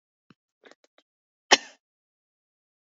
{"three_cough_length": "2.8 s", "three_cough_amplitude": 26885, "three_cough_signal_mean_std_ratio": 0.1, "survey_phase": "alpha (2021-03-01 to 2021-08-12)", "age": "45-64", "gender": "Female", "wearing_mask": "No", "symptom_none": true, "smoker_status": "Never smoked", "respiratory_condition_asthma": false, "respiratory_condition_other": false, "recruitment_source": "Test and Trace", "submission_delay": "-1 day", "covid_test_result": "Negative", "covid_test_method": "LFT"}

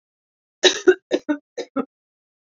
{"three_cough_length": "2.6 s", "three_cough_amplitude": 30957, "three_cough_signal_mean_std_ratio": 0.29, "survey_phase": "beta (2021-08-13 to 2022-03-07)", "age": "45-64", "gender": "Female", "wearing_mask": "No", "symptom_runny_or_blocked_nose": true, "symptom_shortness_of_breath": true, "symptom_sore_throat": true, "symptom_fatigue": true, "symptom_headache": true, "symptom_onset": "3 days", "smoker_status": "Ex-smoker", "respiratory_condition_asthma": false, "respiratory_condition_other": false, "recruitment_source": "Test and Trace", "submission_delay": "2 days", "covid_test_result": "Positive", "covid_test_method": "RT-qPCR", "covid_ct_value": 31.8, "covid_ct_gene": "ORF1ab gene", "covid_ct_mean": 31.9, "covid_viral_load": "35 copies/ml", "covid_viral_load_category": "Minimal viral load (< 10K copies/ml)"}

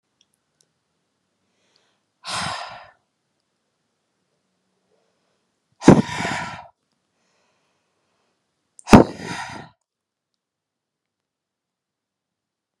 {"exhalation_length": "12.8 s", "exhalation_amplitude": 32768, "exhalation_signal_mean_std_ratio": 0.16, "survey_phase": "beta (2021-08-13 to 2022-03-07)", "age": "18-44", "gender": "Female", "wearing_mask": "No", "symptom_cough_any": true, "symptom_runny_or_blocked_nose": true, "symptom_shortness_of_breath": true, "symptom_sore_throat": true, "symptom_abdominal_pain": true, "symptom_fatigue": true, "symptom_fever_high_temperature": true, "symptom_headache": true, "symptom_onset": "3 days", "smoker_status": "Ex-smoker", "respiratory_condition_asthma": false, "respiratory_condition_other": false, "recruitment_source": "Test and Trace", "submission_delay": "2 days", "covid_test_result": "Positive", "covid_test_method": "RT-qPCR", "covid_ct_value": 26.4, "covid_ct_gene": "ORF1ab gene"}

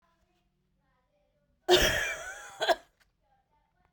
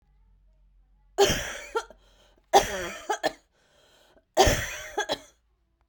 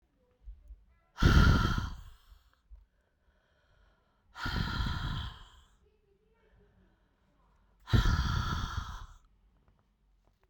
{"cough_length": "3.9 s", "cough_amplitude": 11510, "cough_signal_mean_std_ratio": 0.32, "three_cough_length": "5.9 s", "three_cough_amplitude": 20196, "three_cough_signal_mean_std_ratio": 0.36, "exhalation_length": "10.5 s", "exhalation_amplitude": 10122, "exhalation_signal_mean_std_ratio": 0.37, "survey_phase": "beta (2021-08-13 to 2022-03-07)", "age": "45-64", "gender": "Female", "wearing_mask": "No", "symptom_cough_any": true, "symptom_sore_throat": true, "symptom_fatigue": true, "symptom_headache": true, "symptom_onset": "4 days", "smoker_status": "Ex-smoker", "respiratory_condition_asthma": false, "respiratory_condition_other": false, "recruitment_source": "Test and Trace", "submission_delay": "2 days", "covid_test_result": "Positive", "covid_test_method": "RT-qPCR", "covid_ct_value": 15.2, "covid_ct_gene": "ORF1ab gene", "covid_ct_mean": 15.5, "covid_viral_load": "8400000 copies/ml", "covid_viral_load_category": "High viral load (>1M copies/ml)"}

